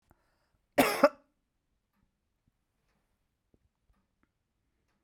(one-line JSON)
{"cough_length": "5.0 s", "cough_amplitude": 12184, "cough_signal_mean_std_ratio": 0.16, "survey_phase": "beta (2021-08-13 to 2022-03-07)", "age": "45-64", "gender": "Female", "wearing_mask": "No", "symptom_cough_any": true, "symptom_fatigue": true, "symptom_headache": true, "symptom_change_to_sense_of_smell_or_taste": true, "symptom_loss_of_taste": true, "symptom_other": true, "symptom_onset": "7 days", "smoker_status": "Never smoked", "respiratory_condition_asthma": false, "respiratory_condition_other": false, "recruitment_source": "Test and Trace", "submission_delay": "5 days", "covid_test_result": "Negative", "covid_test_method": "RT-qPCR"}